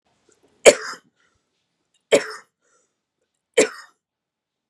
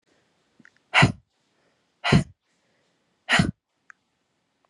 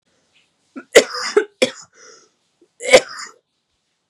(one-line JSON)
{"three_cough_length": "4.7 s", "three_cough_amplitude": 32768, "three_cough_signal_mean_std_ratio": 0.19, "exhalation_length": "4.7 s", "exhalation_amplitude": 22179, "exhalation_signal_mean_std_ratio": 0.26, "cough_length": "4.1 s", "cough_amplitude": 32768, "cough_signal_mean_std_ratio": 0.26, "survey_phase": "beta (2021-08-13 to 2022-03-07)", "age": "18-44", "gender": "Female", "wearing_mask": "No", "symptom_cough_any": true, "symptom_runny_or_blocked_nose": true, "symptom_sore_throat": true, "symptom_fatigue": true, "symptom_headache": true, "symptom_onset": "3 days", "smoker_status": "Never smoked", "respiratory_condition_asthma": false, "respiratory_condition_other": false, "recruitment_source": "Test and Trace", "submission_delay": "1 day", "covid_test_result": "Positive", "covid_test_method": "RT-qPCR", "covid_ct_value": 17.2, "covid_ct_gene": "N gene"}